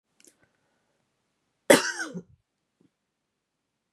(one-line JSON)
{"cough_length": "3.9 s", "cough_amplitude": 27926, "cough_signal_mean_std_ratio": 0.17, "survey_phase": "beta (2021-08-13 to 2022-03-07)", "age": "45-64", "gender": "Female", "wearing_mask": "No", "symptom_new_continuous_cough": true, "symptom_runny_or_blocked_nose": true, "symptom_other": true, "symptom_onset": "3 days", "smoker_status": "Never smoked", "respiratory_condition_asthma": false, "respiratory_condition_other": false, "recruitment_source": "Test and Trace", "submission_delay": "1 day", "covid_test_result": "Positive", "covid_test_method": "RT-qPCR", "covid_ct_value": 18.5, "covid_ct_gene": "ORF1ab gene", "covid_ct_mean": 18.6, "covid_viral_load": "800000 copies/ml", "covid_viral_load_category": "Low viral load (10K-1M copies/ml)"}